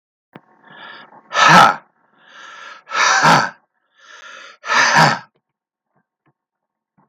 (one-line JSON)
{"exhalation_length": "7.1 s", "exhalation_amplitude": 32768, "exhalation_signal_mean_std_ratio": 0.38, "survey_phase": "beta (2021-08-13 to 2022-03-07)", "age": "45-64", "gender": "Male", "wearing_mask": "No", "symptom_runny_or_blocked_nose": true, "smoker_status": "Never smoked", "respiratory_condition_asthma": false, "respiratory_condition_other": false, "recruitment_source": "REACT", "submission_delay": "4 days", "covid_test_result": "Negative", "covid_test_method": "RT-qPCR"}